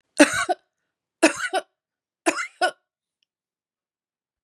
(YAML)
three_cough_length: 4.4 s
three_cough_amplitude: 31625
three_cough_signal_mean_std_ratio: 0.28
survey_phase: beta (2021-08-13 to 2022-03-07)
age: 45-64
gender: Female
wearing_mask: 'No'
symptom_none: true
smoker_status: Never smoked
respiratory_condition_asthma: false
respiratory_condition_other: false
recruitment_source: REACT
submission_delay: 12 days
covid_test_result: Negative
covid_test_method: RT-qPCR
influenza_a_test_result: Negative
influenza_b_test_result: Negative